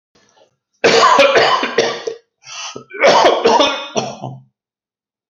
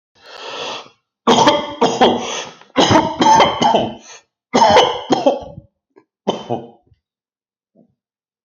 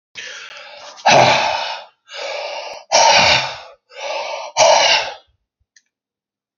cough_length: 5.3 s
cough_amplitude: 31623
cough_signal_mean_std_ratio: 0.56
three_cough_length: 8.4 s
three_cough_amplitude: 32768
three_cough_signal_mean_std_ratio: 0.49
exhalation_length: 6.6 s
exhalation_amplitude: 32767
exhalation_signal_mean_std_ratio: 0.51
survey_phase: alpha (2021-03-01 to 2021-08-12)
age: 45-64
gender: Male
wearing_mask: 'Yes'
symptom_fatigue: true
symptom_headache: true
symptom_onset: 12 days
smoker_status: Never smoked
respiratory_condition_asthma: false
respiratory_condition_other: false
recruitment_source: REACT
submission_delay: 4 days
covid_test_result: Negative
covid_test_method: RT-qPCR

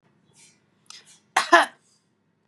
cough_length: 2.5 s
cough_amplitude: 31895
cough_signal_mean_std_ratio: 0.22
survey_phase: beta (2021-08-13 to 2022-03-07)
age: 45-64
gender: Female
wearing_mask: 'No'
symptom_none: true
smoker_status: Never smoked
respiratory_condition_asthma: false
respiratory_condition_other: false
recruitment_source: REACT
submission_delay: 2 days
covid_test_result: Negative
covid_test_method: RT-qPCR
influenza_a_test_result: Negative
influenza_b_test_result: Negative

